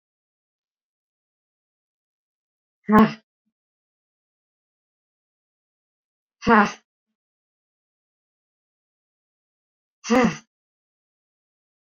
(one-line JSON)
{"exhalation_length": "11.9 s", "exhalation_amplitude": 27304, "exhalation_signal_mean_std_ratio": 0.18, "survey_phase": "beta (2021-08-13 to 2022-03-07)", "age": "45-64", "gender": "Female", "wearing_mask": "No", "symptom_sore_throat": true, "symptom_fatigue": true, "symptom_onset": "13 days", "smoker_status": "Never smoked", "respiratory_condition_asthma": false, "respiratory_condition_other": false, "recruitment_source": "REACT", "submission_delay": "8 days", "covid_test_result": "Negative", "covid_test_method": "RT-qPCR"}